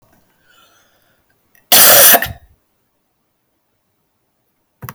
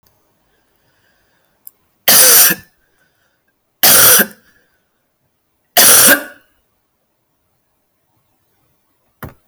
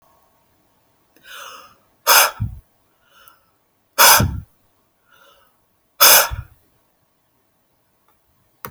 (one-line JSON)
{"cough_length": "4.9 s", "cough_amplitude": 32768, "cough_signal_mean_std_ratio": 0.3, "three_cough_length": "9.5 s", "three_cough_amplitude": 32768, "three_cough_signal_mean_std_ratio": 0.34, "exhalation_length": "8.7 s", "exhalation_amplitude": 32768, "exhalation_signal_mean_std_ratio": 0.27, "survey_phase": "alpha (2021-03-01 to 2021-08-12)", "age": "45-64", "gender": "Female", "wearing_mask": "No", "symptom_new_continuous_cough": true, "smoker_status": "Never smoked", "respiratory_condition_asthma": false, "respiratory_condition_other": false, "recruitment_source": "Test and Trace", "submission_delay": "1 day", "covid_test_result": "Positive", "covid_test_method": "RT-qPCR", "covid_ct_value": 26.5, "covid_ct_gene": "ORF1ab gene"}